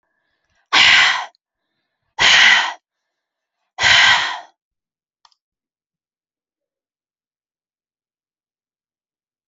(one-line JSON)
{"exhalation_length": "9.5 s", "exhalation_amplitude": 32093, "exhalation_signal_mean_std_ratio": 0.32, "survey_phase": "alpha (2021-03-01 to 2021-08-12)", "age": "18-44", "gender": "Female", "wearing_mask": "No", "symptom_none": true, "smoker_status": "Never smoked", "respiratory_condition_asthma": false, "respiratory_condition_other": false, "recruitment_source": "REACT", "submission_delay": "1 day", "covid_test_result": "Negative", "covid_test_method": "RT-qPCR"}